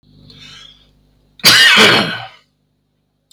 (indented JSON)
{
  "cough_length": "3.3 s",
  "cough_amplitude": 32768,
  "cough_signal_mean_std_ratio": 0.41,
  "survey_phase": "beta (2021-08-13 to 2022-03-07)",
  "age": "45-64",
  "gender": "Male",
  "wearing_mask": "No",
  "symptom_cough_any": true,
  "symptom_diarrhoea": true,
  "smoker_status": "Ex-smoker",
  "respiratory_condition_asthma": false,
  "respiratory_condition_other": false,
  "recruitment_source": "REACT",
  "submission_delay": "0 days",
  "covid_test_result": "Negative",
  "covid_test_method": "RT-qPCR"
}